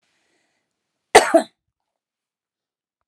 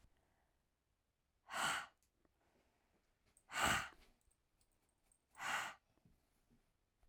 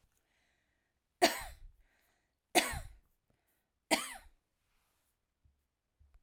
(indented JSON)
{
  "cough_length": "3.1 s",
  "cough_amplitude": 32768,
  "cough_signal_mean_std_ratio": 0.19,
  "exhalation_length": "7.1 s",
  "exhalation_amplitude": 2184,
  "exhalation_signal_mean_std_ratio": 0.31,
  "three_cough_length": "6.2 s",
  "three_cough_amplitude": 11328,
  "three_cough_signal_mean_std_ratio": 0.22,
  "survey_phase": "alpha (2021-03-01 to 2021-08-12)",
  "age": "45-64",
  "gender": "Female",
  "wearing_mask": "No",
  "symptom_none": true,
  "smoker_status": "Never smoked",
  "respiratory_condition_asthma": false,
  "respiratory_condition_other": false,
  "recruitment_source": "REACT",
  "submission_delay": "1 day",
  "covid_test_result": "Negative",
  "covid_test_method": "RT-qPCR"
}